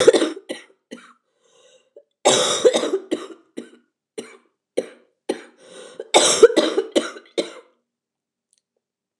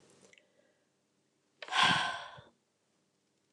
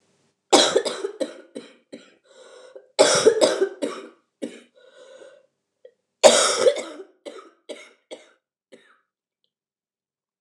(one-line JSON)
{"cough_length": "9.2 s", "cough_amplitude": 29204, "cough_signal_mean_std_ratio": 0.34, "exhalation_length": "3.5 s", "exhalation_amplitude": 7119, "exhalation_signal_mean_std_ratio": 0.3, "three_cough_length": "10.4 s", "three_cough_amplitude": 29204, "three_cough_signal_mean_std_ratio": 0.33, "survey_phase": "beta (2021-08-13 to 2022-03-07)", "age": "45-64", "gender": "Female", "wearing_mask": "No", "symptom_cough_any": true, "symptom_headache": true, "symptom_change_to_sense_of_smell_or_taste": true, "smoker_status": "Ex-smoker", "respiratory_condition_asthma": false, "respiratory_condition_other": false, "recruitment_source": "Test and Trace", "submission_delay": "1 day", "covid_test_result": "Positive", "covid_test_method": "RT-qPCR", "covid_ct_value": 16.5, "covid_ct_gene": "ORF1ab gene"}